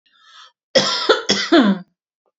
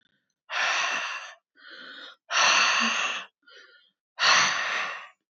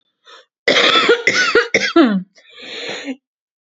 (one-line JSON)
{"three_cough_length": "2.4 s", "three_cough_amplitude": 28879, "three_cough_signal_mean_std_ratio": 0.48, "exhalation_length": "5.3 s", "exhalation_amplitude": 13588, "exhalation_signal_mean_std_ratio": 0.57, "cough_length": "3.7 s", "cough_amplitude": 32767, "cough_signal_mean_std_ratio": 0.55, "survey_phase": "beta (2021-08-13 to 2022-03-07)", "age": "18-44", "gender": "Female", "wearing_mask": "No", "symptom_runny_or_blocked_nose": true, "symptom_abdominal_pain": true, "symptom_fatigue": true, "symptom_onset": "12 days", "smoker_status": "Never smoked", "respiratory_condition_asthma": false, "respiratory_condition_other": false, "recruitment_source": "REACT", "submission_delay": "1 day", "covid_test_result": "Negative", "covid_test_method": "RT-qPCR"}